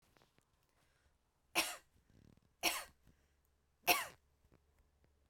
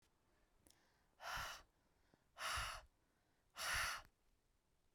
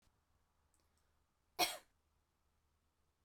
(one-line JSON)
{"three_cough_length": "5.3 s", "three_cough_amplitude": 4964, "three_cough_signal_mean_std_ratio": 0.24, "exhalation_length": "4.9 s", "exhalation_amplitude": 988, "exhalation_signal_mean_std_ratio": 0.43, "cough_length": "3.2 s", "cough_amplitude": 3099, "cough_signal_mean_std_ratio": 0.18, "survey_phase": "beta (2021-08-13 to 2022-03-07)", "age": "18-44", "gender": "Female", "wearing_mask": "No", "symptom_shortness_of_breath": true, "symptom_sore_throat": true, "symptom_fatigue": true, "symptom_headache": true, "symptom_onset": "2 days", "smoker_status": "Never smoked", "respiratory_condition_asthma": false, "respiratory_condition_other": false, "recruitment_source": "Test and Trace", "submission_delay": "2 days", "covid_test_result": "Positive", "covid_test_method": "RT-qPCR", "covid_ct_value": 35.5, "covid_ct_gene": "ORF1ab gene"}